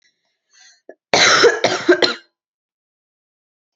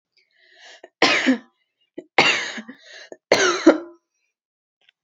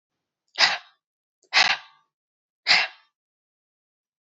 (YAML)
cough_length: 3.8 s
cough_amplitude: 32767
cough_signal_mean_std_ratio: 0.37
three_cough_length: 5.0 s
three_cough_amplitude: 30469
three_cough_signal_mean_std_ratio: 0.36
exhalation_length: 4.3 s
exhalation_amplitude: 24202
exhalation_signal_mean_std_ratio: 0.28
survey_phase: beta (2021-08-13 to 2022-03-07)
age: 18-44
gender: Female
wearing_mask: 'No'
symptom_sore_throat: true
symptom_fatigue: true
symptom_onset: 8 days
smoker_status: Never smoked
respiratory_condition_asthma: false
respiratory_condition_other: false
recruitment_source: REACT
submission_delay: 0 days
covid_test_result: Negative
covid_test_method: RT-qPCR
covid_ct_value: 37.0
covid_ct_gene: N gene
influenza_a_test_result: Negative
influenza_b_test_result: Negative